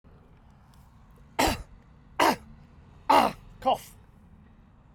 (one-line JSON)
{"cough_length": "4.9 s", "cough_amplitude": 14089, "cough_signal_mean_std_ratio": 0.34, "survey_phase": "beta (2021-08-13 to 2022-03-07)", "age": "65+", "gender": "Male", "wearing_mask": "No", "symptom_none": true, "smoker_status": "Never smoked", "respiratory_condition_asthma": false, "respiratory_condition_other": false, "recruitment_source": "REACT", "submission_delay": "1 day", "covid_test_result": "Negative", "covid_test_method": "RT-qPCR"}